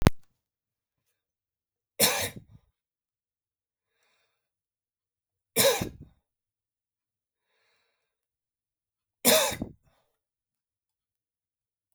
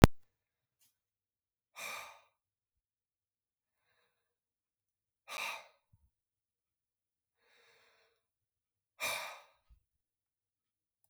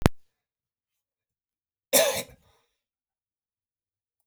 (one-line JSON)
{"three_cough_length": "11.9 s", "three_cough_amplitude": 32768, "three_cough_signal_mean_std_ratio": 0.22, "exhalation_length": "11.1 s", "exhalation_amplitude": 32768, "exhalation_signal_mean_std_ratio": 0.12, "cough_length": "4.3 s", "cough_amplitude": 32768, "cough_signal_mean_std_ratio": 0.22, "survey_phase": "beta (2021-08-13 to 2022-03-07)", "age": "45-64", "gender": "Male", "wearing_mask": "No", "symptom_none": true, "smoker_status": "Never smoked", "respiratory_condition_asthma": false, "respiratory_condition_other": false, "recruitment_source": "REACT", "submission_delay": "3 days", "covid_test_result": "Negative", "covid_test_method": "RT-qPCR", "influenza_a_test_result": "Negative", "influenza_b_test_result": "Negative"}